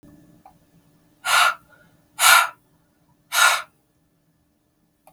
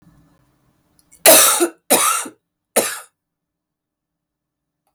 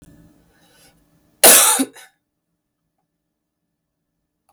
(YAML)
exhalation_length: 5.1 s
exhalation_amplitude: 32768
exhalation_signal_mean_std_ratio: 0.32
three_cough_length: 4.9 s
three_cough_amplitude: 32768
three_cough_signal_mean_std_ratio: 0.33
cough_length: 4.5 s
cough_amplitude: 32768
cough_signal_mean_std_ratio: 0.24
survey_phase: beta (2021-08-13 to 2022-03-07)
age: 45-64
gender: Female
wearing_mask: 'No'
symptom_cough_any: true
symptom_new_continuous_cough: true
symptom_runny_or_blocked_nose: true
symptom_shortness_of_breath: true
symptom_sore_throat: true
symptom_fatigue: true
symptom_headache: true
symptom_change_to_sense_of_smell_or_taste: true
symptom_other: true
symptom_onset: 4 days
smoker_status: Never smoked
respiratory_condition_asthma: false
respiratory_condition_other: false
recruitment_source: Test and Trace
submission_delay: 2 days
covid_test_result: Positive
covid_test_method: RT-qPCR